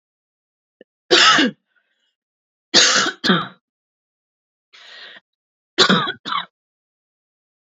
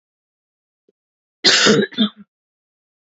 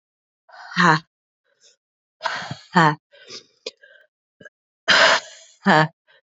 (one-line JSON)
{"three_cough_length": "7.7 s", "three_cough_amplitude": 31058, "three_cough_signal_mean_std_ratio": 0.34, "cough_length": "3.2 s", "cough_amplitude": 32768, "cough_signal_mean_std_ratio": 0.33, "exhalation_length": "6.2 s", "exhalation_amplitude": 28262, "exhalation_signal_mean_std_ratio": 0.34, "survey_phase": "beta (2021-08-13 to 2022-03-07)", "age": "18-44", "gender": "Female", "wearing_mask": "No", "symptom_cough_any": true, "symptom_runny_or_blocked_nose": true, "symptom_shortness_of_breath": true, "symptom_sore_throat": true, "symptom_fatigue": true, "symptom_headache": true, "symptom_other": true, "symptom_onset": "3 days", "smoker_status": "Ex-smoker", "respiratory_condition_asthma": false, "respiratory_condition_other": false, "recruitment_source": "Test and Trace", "submission_delay": "1 day", "covid_test_result": "Positive", "covid_test_method": "RT-qPCR", "covid_ct_value": 20.8, "covid_ct_gene": "ORF1ab gene"}